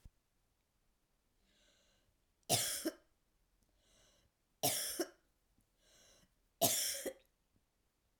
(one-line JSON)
{"three_cough_length": "8.2 s", "three_cough_amplitude": 7538, "three_cough_signal_mean_std_ratio": 0.31, "survey_phase": "alpha (2021-03-01 to 2021-08-12)", "age": "45-64", "gender": "Female", "wearing_mask": "No", "symptom_cough_any": true, "symptom_diarrhoea": true, "symptom_fatigue": true, "smoker_status": "Never smoked", "respiratory_condition_asthma": false, "respiratory_condition_other": false, "recruitment_source": "Test and Trace", "submission_delay": "1 day", "covid_test_result": "Positive", "covid_test_method": "RT-qPCR", "covid_ct_value": 18.7, "covid_ct_gene": "ORF1ab gene", "covid_ct_mean": 19.7, "covid_viral_load": "340000 copies/ml", "covid_viral_load_category": "Low viral load (10K-1M copies/ml)"}